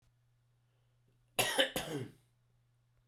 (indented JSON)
{
  "cough_length": "3.1 s",
  "cough_amplitude": 6731,
  "cough_signal_mean_std_ratio": 0.32,
  "survey_phase": "beta (2021-08-13 to 2022-03-07)",
  "age": "45-64",
  "gender": "Male",
  "wearing_mask": "No",
  "symptom_cough_any": true,
  "symptom_fatigue": true,
  "symptom_headache": true,
  "smoker_status": "Never smoked",
  "respiratory_condition_asthma": false,
  "respiratory_condition_other": false,
  "recruitment_source": "Test and Trace",
  "submission_delay": "1 day",
  "covid_test_result": "Positive",
  "covid_test_method": "RT-qPCR",
  "covid_ct_value": 17.5,
  "covid_ct_gene": "ORF1ab gene",
  "covid_ct_mean": 18.0,
  "covid_viral_load": "1200000 copies/ml",
  "covid_viral_load_category": "High viral load (>1M copies/ml)"
}